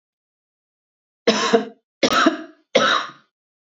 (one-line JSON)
{"three_cough_length": "3.8 s", "three_cough_amplitude": 26940, "three_cough_signal_mean_std_ratio": 0.41, "survey_phase": "beta (2021-08-13 to 2022-03-07)", "age": "18-44", "gender": "Female", "wearing_mask": "No", "symptom_none": true, "smoker_status": "Current smoker (1 to 10 cigarettes per day)", "respiratory_condition_asthma": true, "respiratory_condition_other": false, "recruitment_source": "Test and Trace", "submission_delay": "2 days", "covid_test_result": "Negative", "covid_test_method": "ePCR"}